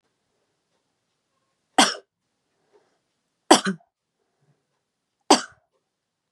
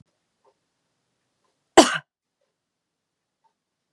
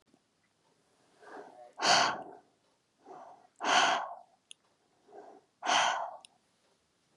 three_cough_length: 6.3 s
three_cough_amplitude: 32767
three_cough_signal_mean_std_ratio: 0.17
cough_length: 3.9 s
cough_amplitude: 32768
cough_signal_mean_std_ratio: 0.13
exhalation_length: 7.2 s
exhalation_amplitude: 8050
exhalation_signal_mean_std_ratio: 0.36
survey_phase: beta (2021-08-13 to 2022-03-07)
age: 18-44
gender: Female
wearing_mask: 'No'
symptom_none: true
smoker_status: Ex-smoker
respiratory_condition_asthma: false
respiratory_condition_other: false
recruitment_source: REACT
submission_delay: 2 days
covid_test_result: Negative
covid_test_method: RT-qPCR
influenza_a_test_result: Negative
influenza_b_test_result: Negative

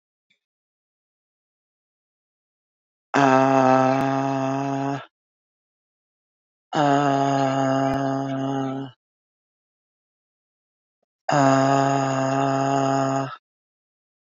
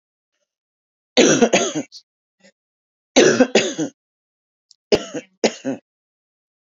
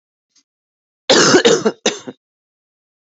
exhalation_length: 14.3 s
exhalation_amplitude: 22811
exhalation_signal_mean_std_ratio: 0.54
three_cough_length: 6.7 s
three_cough_amplitude: 29207
three_cough_signal_mean_std_ratio: 0.34
cough_length: 3.1 s
cough_amplitude: 32767
cough_signal_mean_std_ratio: 0.38
survey_phase: beta (2021-08-13 to 2022-03-07)
age: 45-64
gender: Female
wearing_mask: 'No'
symptom_cough_any: true
symptom_sore_throat: true
symptom_fever_high_temperature: true
symptom_headache: true
smoker_status: Ex-smoker
respiratory_condition_asthma: false
respiratory_condition_other: false
recruitment_source: Test and Trace
submission_delay: 1 day
covid_test_result: Positive
covid_test_method: LFT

